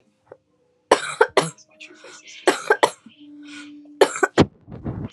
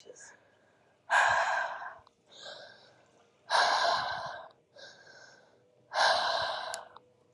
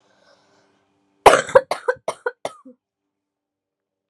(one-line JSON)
{"three_cough_length": "5.1 s", "three_cough_amplitude": 32767, "three_cough_signal_mean_std_ratio": 0.32, "exhalation_length": "7.3 s", "exhalation_amplitude": 7269, "exhalation_signal_mean_std_ratio": 0.49, "cough_length": "4.1 s", "cough_amplitude": 32768, "cough_signal_mean_std_ratio": 0.21, "survey_phase": "alpha (2021-03-01 to 2021-08-12)", "age": "18-44", "gender": "Female", "wearing_mask": "No", "symptom_cough_any": true, "symptom_diarrhoea": true, "symptom_fatigue": true, "symptom_fever_high_temperature": true, "symptom_headache": true, "symptom_onset": "4 days", "smoker_status": "Never smoked", "respiratory_condition_asthma": false, "respiratory_condition_other": false, "recruitment_source": "Test and Trace", "submission_delay": "1 day", "covid_test_result": "Positive", "covid_test_method": "RT-qPCR", "covid_ct_value": 15.3, "covid_ct_gene": "ORF1ab gene", "covid_ct_mean": 15.5, "covid_viral_load": "8300000 copies/ml", "covid_viral_load_category": "High viral load (>1M copies/ml)"}